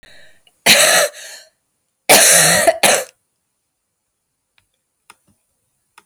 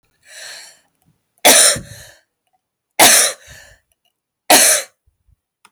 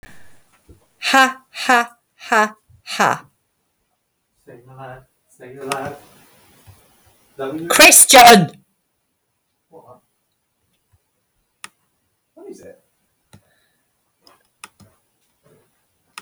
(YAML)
cough_length: 6.1 s
cough_amplitude: 32768
cough_signal_mean_std_ratio: 0.39
three_cough_length: 5.7 s
three_cough_amplitude: 32768
three_cough_signal_mean_std_ratio: 0.35
exhalation_length: 16.2 s
exhalation_amplitude: 32768
exhalation_signal_mean_std_ratio: 0.26
survey_phase: alpha (2021-03-01 to 2021-08-12)
age: 45-64
gender: Female
wearing_mask: 'No'
symptom_headache: true
symptom_onset: 4 days
smoker_status: Ex-smoker
respiratory_condition_asthma: true
respiratory_condition_other: false
recruitment_source: REACT
submission_delay: 3 days
covid_test_result: Negative
covid_test_method: RT-qPCR